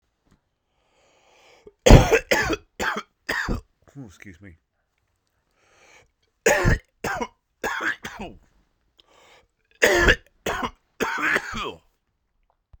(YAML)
three_cough_length: 12.8 s
three_cough_amplitude: 32768
three_cough_signal_mean_std_ratio: 0.32
survey_phase: beta (2021-08-13 to 2022-03-07)
age: 45-64
gender: Male
wearing_mask: 'No'
symptom_cough_any: true
symptom_fatigue: true
symptom_fever_high_temperature: true
symptom_headache: true
symptom_change_to_sense_of_smell_or_taste: true
symptom_onset: 3 days
smoker_status: Never smoked
respiratory_condition_asthma: false
respiratory_condition_other: false
recruitment_source: Test and Trace
submission_delay: 2 days
covid_test_result: Positive
covid_test_method: RT-qPCR
covid_ct_value: 24.9
covid_ct_gene: ORF1ab gene